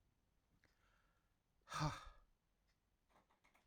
{"exhalation_length": "3.7 s", "exhalation_amplitude": 944, "exhalation_signal_mean_std_ratio": 0.26, "survey_phase": "alpha (2021-03-01 to 2021-08-12)", "age": "18-44", "gender": "Male", "wearing_mask": "No", "symptom_cough_any": true, "symptom_diarrhoea": true, "symptom_fatigue": true, "symptom_fever_high_temperature": true, "symptom_headache": true, "symptom_onset": "5 days", "smoker_status": "Current smoker (e-cigarettes or vapes only)", "respiratory_condition_asthma": false, "respiratory_condition_other": false, "recruitment_source": "Test and Trace", "submission_delay": "2 days", "covid_test_result": "Positive", "covid_test_method": "RT-qPCR", "covid_ct_value": 11.6, "covid_ct_gene": "N gene", "covid_ct_mean": 11.8, "covid_viral_load": "130000000 copies/ml", "covid_viral_load_category": "High viral load (>1M copies/ml)"}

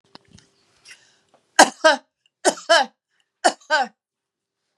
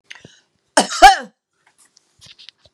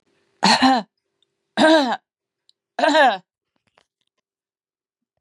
{"three_cough_length": "4.8 s", "three_cough_amplitude": 32768, "three_cough_signal_mean_std_ratio": 0.28, "cough_length": "2.7 s", "cough_amplitude": 32768, "cough_signal_mean_std_ratio": 0.24, "exhalation_length": "5.2 s", "exhalation_amplitude": 27705, "exhalation_signal_mean_std_ratio": 0.38, "survey_phase": "beta (2021-08-13 to 2022-03-07)", "age": "65+", "gender": "Female", "wearing_mask": "No", "symptom_none": true, "smoker_status": "Never smoked", "respiratory_condition_asthma": false, "respiratory_condition_other": false, "recruitment_source": "REACT", "submission_delay": "2 days", "covid_test_result": "Negative", "covid_test_method": "RT-qPCR", "influenza_a_test_result": "Negative", "influenza_b_test_result": "Negative"}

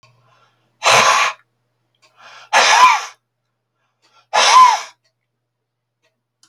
{"exhalation_length": "6.5 s", "exhalation_amplitude": 32768, "exhalation_signal_mean_std_ratio": 0.39, "survey_phase": "beta (2021-08-13 to 2022-03-07)", "age": "65+", "gender": "Male", "wearing_mask": "No", "symptom_none": true, "smoker_status": "Never smoked", "respiratory_condition_asthma": false, "respiratory_condition_other": false, "recruitment_source": "REACT", "submission_delay": "8 days", "covid_test_result": "Negative", "covid_test_method": "RT-qPCR"}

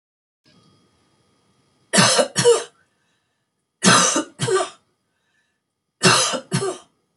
{"three_cough_length": "7.2 s", "three_cough_amplitude": 30881, "three_cough_signal_mean_std_ratio": 0.4, "survey_phase": "beta (2021-08-13 to 2022-03-07)", "age": "65+", "gender": "Female", "wearing_mask": "No", "symptom_none": true, "smoker_status": "Never smoked", "respiratory_condition_asthma": false, "respiratory_condition_other": false, "recruitment_source": "REACT", "submission_delay": "1 day", "covid_test_result": "Negative", "covid_test_method": "RT-qPCR"}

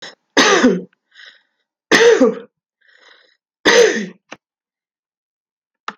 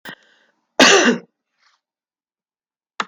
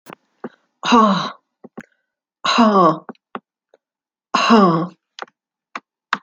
{"three_cough_length": "6.0 s", "three_cough_amplitude": 32768, "three_cough_signal_mean_std_ratio": 0.38, "cough_length": "3.1 s", "cough_amplitude": 32768, "cough_signal_mean_std_ratio": 0.29, "exhalation_length": "6.2 s", "exhalation_amplitude": 27723, "exhalation_signal_mean_std_ratio": 0.41, "survey_phase": "beta (2021-08-13 to 2022-03-07)", "age": "65+", "gender": "Female", "wearing_mask": "No", "symptom_none": true, "smoker_status": "Ex-smoker", "respiratory_condition_asthma": false, "respiratory_condition_other": false, "recruitment_source": "REACT", "submission_delay": "1 day", "covid_test_result": "Negative", "covid_test_method": "RT-qPCR", "influenza_a_test_result": "Negative", "influenza_b_test_result": "Negative"}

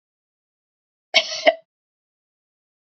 {"cough_length": "2.8 s", "cough_amplitude": 32522, "cough_signal_mean_std_ratio": 0.2, "survey_phase": "beta (2021-08-13 to 2022-03-07)", "age": "18-44", "gender": "Female", "wearing_mask": "No", "symptom_none": true, "symptom_onset": "12 days", "smoker_status": "Ex-smoker", "respiratory_condition_asthma": false, "respiratory_condition_other": false, "recruitment_source": "REACT", "submission_delay": "2 days", "covid_test_result": "Negative", "covid_test_method": "RT-qPCR", "influenza_a_test_result": "Negative", "influenza_b_test_result": "Negative"}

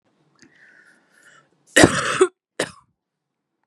{"cough_length": "3.7 s", "cough_amplitude": 32767, "cough_signal_mean_std_ratio": 0.26, "survey_phase": "beta (2021-08-13 to 2022-03-07)", "age": "18-44", "gender": "Female", "wearing_mask": "No", "symptom_cough_any": true, "symptom_new_continuous_cough": true, "symptom_runny_or_blocked_nose": true, "symptom_shortness_of_breath": true, "symptom_sore_throat": true, "symptom_diarrhoea": true, "symptom_fatigue": true, "symptom_headache": true, "symptom_onset": "3 days", "smoker_status": "Never smoked", "respiratory_condition_asthma": false, "respiratory_condition_other": false, "recruitment_source": "Test and Trace", "submission_delay": "2 days", "covid_test_result": "Positive", "covid_test_method": "RT-qPCR", "covid_ct_value": 25.3, "covid_ct_gene": "ORF1ab gene", "covid_ct_mean": 25.5, "covid_viral_load": "4300 copies/ml", "covid_viral_load_category": "Minimal viral load (< 10K copies/ml)"}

